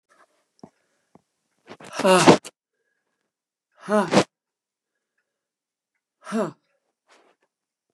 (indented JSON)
{
  "exhalation_length": "7.9 s",
  "exhalation_amplitude": 32767,
  "exhalation_signal_mean_std_ratio": 0.24,
  "survey_phase": "beta (2021-08-13 to 2022-03-07)",
  "age": "65+",
  "gender": "Female",
  "wearing_mask": "No",
  "symptom_cough_any": true,
  "symptom_runny_or_blocked_nose": true,
  "symptom_shortness_of_breath": true,
  "symptom_sore_throat": true,
  "symptom_fever_high_temperature": true,
  "symptom_headache": true,
  "smoker_status": "Never smoked",
  "respiratory_condition_asthma": false,
  "respiratory_condition_other": false,
  "recruitment_source": "Test and Trace",
  "submission_delay": "1 day",
  "covid_test_result": "Positive",
  "covid_test_method": "LFT"
}